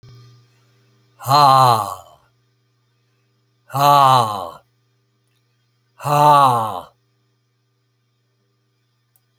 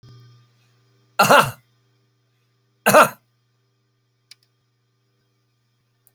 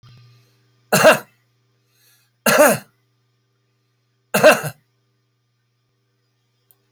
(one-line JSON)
{"exhalation_length": "9.4 s", "exhalation_amplitude": 29972, "exhalation_signal_mean_std_ratio": 0.36, "cough_length": "6.1 s", "cough_amplitude": 32170, "cough_signal_mean_std_ratio": 0.22, "three_cough_length": "6.9 s", "three_cough_amplitude": 32767, "three_cough_signal_mean_std_ratio": 0.27, "survey_phase": "alpha (2021-03-01 to 2021-08-12)", "age": "65+", "gender": "Male", "wearing_mask": "No", "symptom_none": true, "smoker_status": "Never smoked", "respiratory_condition_asthma": false, "respiratory_condition_other": false, "recruitment_source": "REACT", "submission_delay": "8 days", "covid_test_result": "Negative", "covid_test_method": "RT-qPCR"}